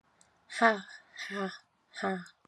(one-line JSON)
{"exhalation_length": "2.5 s", "exhalation_amplitude": 11068, "exhalation_signal_mean_std_ratio": 0.38, "survey_phase": "alpha (2021-03-01 to 2021-08-12)", "age": "18-44", "gender": "Female", "wearing_mask": "No", "symptom_cough_any": true, "symptom_onset": "8 days", "smoker_status": "Never smoked", "respiratory_condition_asthma": false, "respiratory_condition_other": true, "recruitment_source": "Test and Trace", "submission_delay": "2 days", "covid_test_result": "Positive", "covid_test_method": "RT-qPCR"}